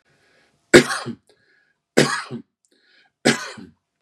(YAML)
three_cough_length: 4.0 s
three_cough_amplitude: 32768
three_cough_signal_mean_std_ratio: 0.27
survey_phase: beta (2021-08-13 to 2022-03-07)
age: 45-64
gender: Male
wearing_mask: 'No'
symptom_none: true
smoker_status: Never smoked
respiratory_condition_asthma: false
respiratory_condition_other: false
recruitment_source: REACT
submission_delay: 2 days
covid_test_result: Negative
covid_test_method: RT-qPCR
influenza_a_test_result: Negative
influenza_b_test_result: Negative